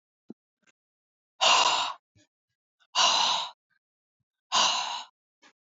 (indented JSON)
{
  "exhalation_length": "5.7 s",
  "exhalation_amplitude": 12002,
  "exhalation_signal_mean_std_ratio": 0.41,
  "survey_phase": "beta (2021-08-13 to 2022-03-07)",
  "age": "45-64",
  "gender": "Female",
  "wearing_mask": "No",
  "symptom_none": true,
  "smoker_status": "Never smoked",
  "respiratory_condition_asthma": true,
  "respiratory_condition_other": false,
  "recruitment_source": "REACT",
  "submission_delay": "3 days",
  "covid_test_result": "Negative",
  "covid_test_method": "RT-qPCR",
  "influenza_a_test_result": "Negative",
  "influenza_b_test_result": "Negative"
}